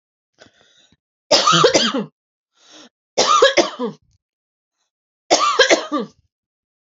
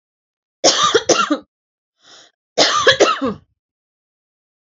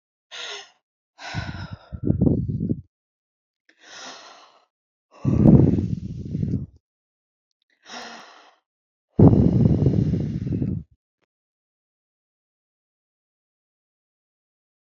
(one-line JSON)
{"three_cough_length": "7.0 s", "three_cough_amplitude": 32768, "three_cough_signal_mean_std_ratio": 0.41, "cough_length": "4.6 s", "cough_amplitude": 31845, "cough_signal_mean_std_ratio": 0.42, "exhalation_length": "14.8 s", "exhalation_amplitude": 32767, "exhalation_signal_mean_std_ratio": 0.36, "survey_phase": "beta (2021-08-13 to 2022-03-07)", "age": "18-44", "gender": "Female", "wearing_mask": "No", "symptom_none": true, "smoker_status": "Ex-smoker", "respiratory_condition_asthma": false, "respiratory_condition_other": false, "recruitment_source": "REACT", "submission_delay": "2 days", "covid_test_result": "Negative", "covid_test_method": "RT-qPCR", "influenza_a_test_result": "Negative", "influenza_b_test_result": "Negative"}